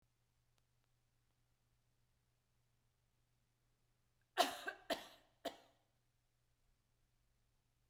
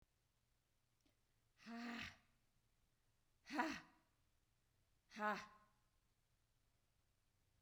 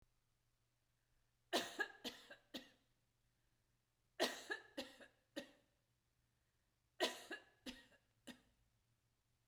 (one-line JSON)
{"cough_length": "7.9 s", "cough_amplitude": 3521, "cough_signal_mean_std_ratio": 0.18, "exhalation_length": "7.6 s", "exhalation_amplitude": 1619, "exhalation_signal_mean_std_ratio": 0.3, "three_cough_length": "9.5 s", "three_cough_amplitude": 2000, "three_cough_signal_mean_std_ratio": 0.29, "survey_phase": "beta (2021-08-13 to 2022-03-07)", "age": "45-64", "gender": "Female", "wearing_mask": "No", "symptom_none": true, "smoker_status": "Never smoked", "respiratory_condition_asthma": false, "respiratory_condition_other": false, "recruitment_source": "REACT", "submission_delay": "1 day", "covid_test_result": "Negative", "covid_test_method": "RT-qPCR"}